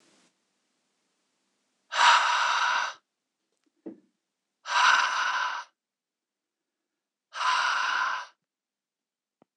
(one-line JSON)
{"exhalation_length": "9.6 s", "exhalation_amplitude": 15935, "exhalation_signal_mean_std_ratio": 0.43, "survey_phase": "beta (2021-08-13 to 2022-03-07)", "age": "45-64", "gender": "Male", "wearing_mask": "No", "symptom_none": true, "smoker_status": "Never smoked", "respiratory_condition_asthma": true, "respiratory_condition_other": false, "recruitment_source": "REACT", "submission_delay": "1 day", "covid_test_result": "Negative", "covid_test_method": "RT-qPCR", "influenza_a_test_result": "Negative", "influenza_b_test_result": "Negative"}